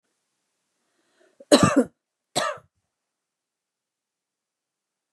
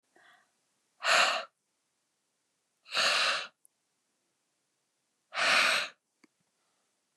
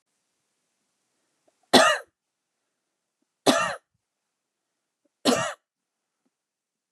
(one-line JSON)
{"cough_length": "5.1 s", "cough_amplitude": 29044, "cough_signal_mean_std_ratio": 0.21, "exhalation_length": "7.2 s", "exhalation_amplitude": 9298, "exhalation_signal_mean_std_ratio": 0.36, "three_cough_length": "6.9 s", "three_cough_amplitude": 30249, "three_cough_signal_mean_std_ratio": 0.24, "survey_phase": "beta (2021-08-13 to 2022-03-07)", "age": "45-64", "gender": "Female", "wearing_mask": "No", "symptom_none": true, "smoker_status": "Never smoked", "respiratory_condition_asthma": false, "respiratory_condition_other": false, "recruitment_source": "REACT", "submission_delay": "1 day", "covid_test_result": "Negative", "covid_test_method": "RT-qPCR", "influenza_a_test_result": "Negative", "influenza_b_test_result": "Negative"}